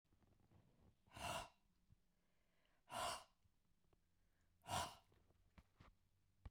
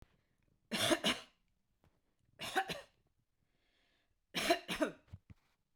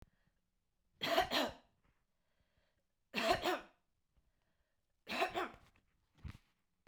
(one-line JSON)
{"exhalation_length": "6.5 s", "exhalation_amplitude": 873, "exhalation_signal_mean_std_ratio": 0.35, "cough_length": "5.8 s", "cough_amplitude": 4491, "cough_signal_mean_std_ratio": 0.34, "three_cough_length": "6.9 s", "three_cough_amplitude": 3671, "three_cough_signal_mean_std_ratio": 0.34, "survey_phase": "beta (2021-08-13 to 2022-03-07)", "age": "65+", "gender": "Female", "wearing_mask": "No", "symptom_none": true, "smoker_status": "Ex-smoker", "respiratory_condition_asthma": false, "respiratory_condition_other": false, "recruitment_source": "REACT", "submission_delay": "2 days", "covid_test_result": "Negative", "covid_test_method": "RT-qPCR", "influenza_a_test_result": "Negative", "influenza_b_test_result": "Negative"}